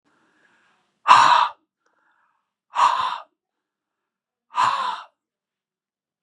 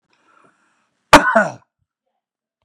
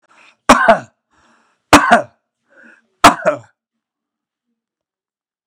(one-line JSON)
{"exhalation_length": "6.2 s", "exhalation_amplitude": 32768, "exhalation_signal_mean_std_ratio": 0.32, "cough_length": "2.6 s", "cough_amplitude": 32768, "cough_signal_mean_std_ratio": 0.24, "three_cough_length": "5.5 s", "three_cough_amplitude": 32768, "three_cough_signal_mean_std_ratio": 0.28, "survey_phase": "beta (2021-08-13 to 2022-03-07)", "age": "45-64", "gender": "Male", "wearing_mask": "No", "symptom_none": true, "smoker_status": "Ex-smoker", "respiratory_condition_asthma": true, "respiratory_condition_other": false, "recruitment_source": "REACT", "submission_delay": "2 days", "covid_test_result": "Negative", "covid_test_method": "RT-qPCR", "influenza_a_test_result": "Negative", "influenza_b_test_result": "Negative"}